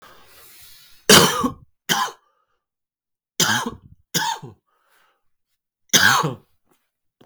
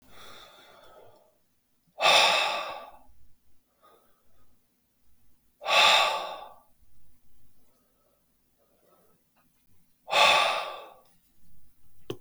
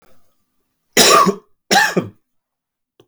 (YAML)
three_cough_length: 7.3 s
three_cough_amplitude: 32768
three_cough_signal_mean_std_ratio: 0.33
exhalation_length: 12.2 s
exhalation_amplitude: 14500
exhalation_signal_mean_std_ratio: 0.36
cough_length: 3.1 s
cough_amplitude: 32768
cough_signal_mean_std_ratio: 0.39
survey_phase: beta (2021-08-13 to 2022-03-07)
age: 18-44
gender: Male
wearing_mask: 'No'
symptom_cough_any: true
symptom_new_continuous_cough: true
symptom_fatigue: true
symptom_onset: 4 days
smoker_status: Never smoked
respiratory_condition_asthma: false
respiratory_condition_other: false
recruitment_source: Test and Trace
submission_delay: 2 days
covid_test_result: Positive
covid_test_method: RT-qPCR